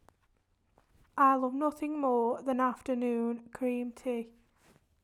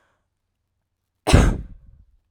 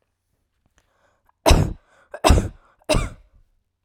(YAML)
exhalation_length: 5.0 s
exhalation_amplitude: 6414
exhalation_signal_mean_std_ratio: 0.61
cough_length: 2.3 s
cough_amplitude: 30503
cough_signal_mean_std_ratio: 0.29
three_cough_length: 3.8 s
three_cough_amplitude: 32767
three_cough_signal_mean_std_ratio: 0.32
survey_phase: alpha (2021-03-01 to 2021-08-12)
age: 18-44
gender: Female
wearing_mask: 'No'
symptom_none: true
smoker_status: Never smoked
respiratory_condition_asthma: false
respiratory_condition_other: false
recruitment_source: REACT
submission_delay: 1 day
covid_test_result: Negative
covid_test_method: RT-qPCR